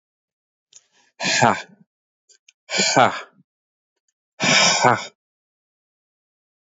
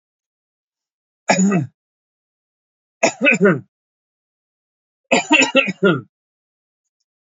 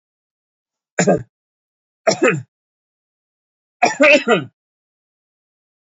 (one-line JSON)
{"exhalation_length": "6.7 s", "exhalation_amplitude": 27942, "exhalation_signal_mean_std_ratio": 0.35, "three_cough_length": "7.3 s", "three_cough_amplitude": 32767, "three_cough_signal_mean_std_ratio": 0.35, "cough_length": "5.9 s", "cough_amplitude": 29862, "cough_signal_mean_std_ratio": 0.31, "survey_phase": "alpha (2021-03-01 to 2021-08-12)", "age": "45-64", "gender": "Male", "wearing_mask": "Yes", "symptom_none": true, "smoker_status": "Never smoked", "respiratory_condition_asthma": false, "respiratory_condition_other": false, "recruitment_source": "Test and Trace", "submission_delay": "2 days", "covid_test_result": "Positive", "covid_test_method": "LFT"}